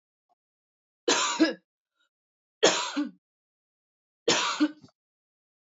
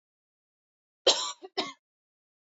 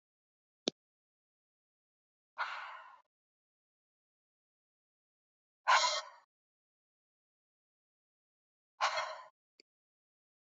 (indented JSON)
{
  "three_cough_length": "5.6 s",
  "three_cough_amplitude": 16130,
  "three_cough_signal_mean_std_ratio": 0.35,
  "cough_length": "2.5 s",
  "cough_amplitude": 12555,
  "cough_signal_mean_std_ratio": 0.25,
  "exhalation_length": "10.5 s",
  "exhalation_amplitude": 7591,
  "exhalation_signal_mean_std_ratio": 0.21,
  "survey_phase": "beta (2021-08-13 to 2022-03-07)",
  "age": "18-44",
  "gender": "Female",
  "wearing_mask": "No",
  "symptom_none": true,
  "smoker_status": "Ex-smoker",
  "respiratory_condition_asthma": false,
  "respiratory_condition_other": false,
  "recruitment_source": "REACT",
  "submission_delay": "2 days",
  "covid_test_result": "Negative",
  "covid_test_method": "RT-qPCR",
  "influenza_a_test_result": "Unknown/Void",
  "influenza_b_test_result": "Unknown/Void"
}